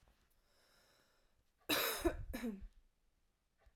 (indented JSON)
{
  "cough_length": "3.8 s",
  "cough_amplitude": 2720,
  "cough_signal_mean_std_ratio": 0.38,
  "survey_phase": "alpha (2021-03-01 to 2021-08-12)",
  "age": "18-44",
  "gender": "Female",
  "wearing_mask": "No",
  "symptom_none": true,
  "smoker_status": "Ex-smoker",
  "respiratory_condition_asthma": true,
  "respiratory_condition_other": false,
  "recruitment_source": "REACT",
  "submission_delay": "3 days",
  "covid_test_result": "Negative",
  "covid_test_method": "RT-qPCR"
}